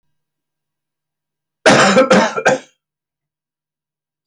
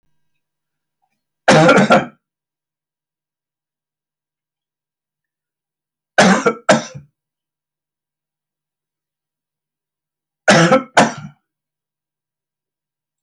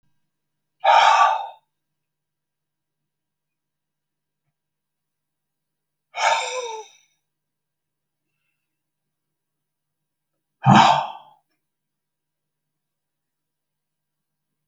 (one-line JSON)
{"cough_length": "4.3 s", "cough_amplitude": 30622, "cough_signal_mean_std_ratio": 0.36, "three_cough_length": "13.2 s", "three_cough_amplitude": 32271, "three_cough_signal_mean_std_ratio": 0.27, "exhalation_length": "14.7 s", "exhalation_amplitude": 30720, "exhalation_signal_mean_std_ratio": 0.24, "survey_phase": "alpha (2021-03-01 to 2021-08-12)", "age": "65+", "gender": "Male", "wearing_mask": "No", "symptom_none": true, "smoker_status": "Ex-smoker", "respiratory_condition_asthma": false, "respiratory_condition_other": false, "recruitment_source": "REACT", "submission_delay": "1 day", "covid_test_result": "Negative", "covid_test_method": "RT-qPCR"}